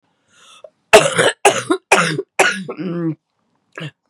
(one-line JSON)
{"cough_length": "4.1 s", "cough_amplitude": 32768, "cough_signal_mean_std_ratio": 0.44, "survey_phase": "beta (2021-08-13 to 2022-03-07)", "age": "45-64", "gender": "Female", "wearing_mask": "No", "symptom_cough_any": true, "symptom_runny_or_blocked_nose": true, "symptom_shortness_of_breath": true, "symptom_fatigue": true, "symptom_fever_high_temperature": true, "symptom_headache": true, "symptom_change_to_sense_of_smell_or_taste": true, "smoker_status": "Ex-smoker", "respiratory_condition_asthma": false, "respiratory_condition_other": false, "recruitment_source": "Test and Trace", "submission_delay": "2 days", "covid_test_result": "Positive", "covid_test_method": "LFT"}